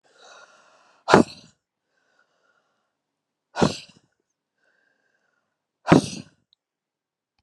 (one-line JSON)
{"exhalation_length": "7.4 s", "exhalation_amplitude": 32768, "exhalation_signal_mean_std_ratio": 0.18, "survey_phase": "beta (2021-08-13 to 2022-03-07)", "age": "65+", "gender": "Female", "wearing_mask": "No", "symptom_none": true, "smoker_status": "Ex-smoker", "respiratory_condition_asthma": false, "respiratory_condition_other": false, "recruitment_source": "REACT", "submission_delay": "2 days", "covid_test_result": "Negative", "covid_test_method": "RT-qPCR", "influenza_a_test_result": "Unknown/Void", "influenza_b_test_result": "Unknown/Void"}